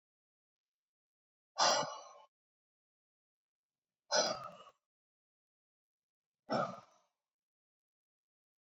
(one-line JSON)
{"exhalation_length": "8.6 s", "exhalation_amplitude": 4321, "exhalation_signal_mean_std_ratio": 0.25, "survey_phase": "beta (2021-08-13 to 2022-03-07)", "age": "65+", "gender": "Male", "wearing_mask": "No", "symptom_none": true, "smoker_status": "Never smoked", "respiratory_condition_asthma": false, "respiratory_condition_other": false, "recruitment_source": "REACT", "submission_delay": "1 day", "covid_test_result": "Negative", "covid_test_method": "RT-qPCR"}